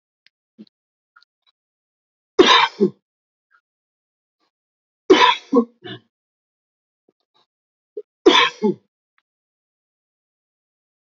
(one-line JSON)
{"three_cough_length": "11.0 s", "three_cough_amplitude": 29367, "three_cough_signal_mean_std_ratio": 0.24, "survey_phase": "beta (2021-08-13 to 2022-03-07)", "age": "45-64", "gender": "Male", "wearing_mask": "No", "symptom_none": true, "smoker_status": "Never smoked", "respiratory_condition_asthma": false, "respiratory_condition_other": false, "recruitment_source": "REACT", "submission_delay": "1 day", "covid_test_result": "Negative", "covid_test_method": "RT-qPCR"}